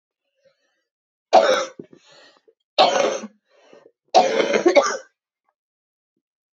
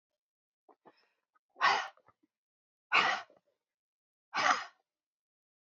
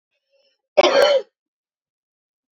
{"three_cough_length": "6.6 s", "three_cough_amplitude": 30003, "three_cough_signal_mean_std_ratio": 0.36, "exhalation_length": "5.6 s", "exhalation_amplitude": 7727, "exhalation_signal_mean_std_ratio": 0.29, "cough_length": "2.6 s", "cough_amplitude": 27165, "cough_signal_mean_std_ratio": 0.33, "survey_phase": "beta (2021-08-13 to 2022-03-07)", "age": "18-44", "gender": "Female", "wearing_mask": "No", "symptom_cough_any": true, "symptom_new_continuous_cough": true, "symptom_runny_or_blocked_nose": true, "symptom_shortness_of_breath": true, "symptom_fatigue": true, "symptom_headache": true, "symptom_change_to_sense_of_smell_or_taste": true, "symptom_loss_of_taste": true, "symptom_onset": "3 days", "smoker_status": "Ex-smoker", "respiratory_condition_asthma": true, "respiratory_condition_other": false, "recruitment_source": "Test and Trace", "submission_delay": "2 days", "covid_test_result": "Positive", "covid_test_method": "RT-qPCR", "covid_ct_value": 19.9, "covid_ct_gene": "N gene"}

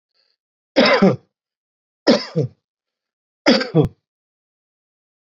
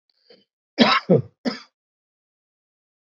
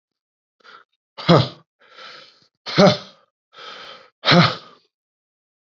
{"three_cough_length": "5.4 s", "three_cough_amplitude": 29226, "three_cough_signal_mean_std_ratio": 0.33, "cough_length": "3.2 s", "cough_amplitude": 27594, "cough_signal_mean_std_ratio": 0.27, "exhalation_length": "5.7 s", "exhalation_amplitude": 28499, "exhalation_signal_mean_std_ratio": 0.29, "survey_phase": "beta (2021-08-13 to 2022-03-07)", "age": "45-64", "gender": "Male", "wearing_mask": "No", "symptom_cough_any": true, "symptom_runny_or_blocked_nose": true, "symptom_onset": "7 days", "smoker_status": "Ex-smoker", "respiratory_condition_asthma": true, "respiratory_condition_other": false, "recruitment_source": "REACT", "submission_delay": "0 days", "covid_test_result": "Negative", "covid_test_method": "RT-qPCR", "influenza_a_test_result": "Negative", "influenza_b_test_result": "Negative"}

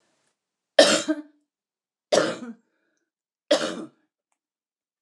{"three_cough_length": "5.0 s", "three_cough_amplitude": 29067, "three_cough_signal_mean_std_ratio": 0.28, "survey_phase": "alpha (2021-03-01 to 2021-08-12)", "age": "65+", "gender": "Female", "wearing_mask": "No", "symptom_change_to_sense_of_smell_or_taste": true, "smoker_status": "Never smoked", "respiratory_condition_asthma": false, "respiratory_condition_other": false, "recruitment_source": "REACT", "submission_delay": "2 days", "covid_test_result": "Negative", "covid_test_method": "RT-qPCR"}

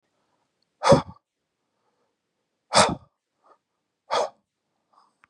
{"exhalation_length": "5.3 s", "exhalation_amplitude": 27748, "exhalation_signal_mean_std_ratio": 0.23, "survey_phase": "beta (2021-08-13 to 2022-03-07)", "age": "18-44", "gender": "Male", "wearing_mask": "No", "symptom_none": true, "smoker_status": "Never smoked", "respiratory_condition_asthma": false, "respiratory_condition_other": false, "recruitment_source": "REACT", "submission_delay": "2 days", "covid_test_result": "Negative", "covid_test_method": "RT-qPCR", "influenza_a_test_result": "Negative", "influenza_b_test_result": "Negative"}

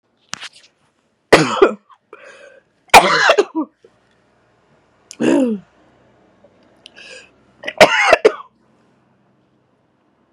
{"three_cough_length": "10.3 s", "three_cough_amplitude": 32768, "three_cough_signal_mean_std_ratio": 0.31, "survey_phase": "beta (2021-08-13 to 2022-03-07)", "age": "18-44", "gender": "Female", "wearing_mask": "No", "symptom_cough_any": true, "symptom_runny_or_blocked_nose": true, "symptom_shortness_of_breath": true, "symptom_fatigue": true, "symptom_headache": true, "symptom_change_to_sense_of_smell_or_taste": true, "symptom_loss_of_taste": true, "symptom_onset": "3 days", "smoker_status": "Never smoked", "respiratory_condition_asthma": true, "respiratory_condition_other": false, "recruitment_source": "Test and Trace", "submission_delay": "2 days", "covid_test_result": "Positive", "covid_test_method": "RT-qPCR", "covid_ct_value": 21.2, "covid_ct_gene": "ORF1ab gene", "covid_ct_mean": 22.0, "covid_viral_load": "60000 copies/ml", "covid_viral_load_category": "Low viral load (10K-1M copies/ml)"}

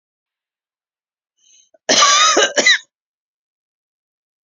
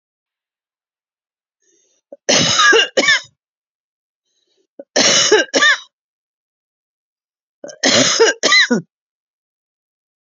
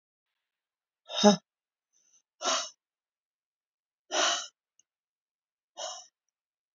{"cough_length": "4.4 s", "cough_amplitude": 32538, "cough_signal_mean_std_ratio": 0.35, "three_cough_length": "10.2 s", "three_cough_amplitude": 32767, "three_cough_signal_mean_std_ratio": 0.4, "exhalation_length": "6.7 s", "exhalation_amplitude": 16325, "exhalation_signal_mean_std_ratio": 0.24, "survey_phase": "alpha (2021-03-01 to 2021-08-12)", "age": "45-64", "gender": "Female", "wearing_mask": "No", "symptom_none": true, "smoker_status": "Ex-smoker", "respiratory_condition_asthma": true, "respiratory_condition_other": false, "recruitment_source": "REACT", "submission_delay": "1 day", "covid_test_result": "Negative", "covid_test_method": "RT-qPCR"}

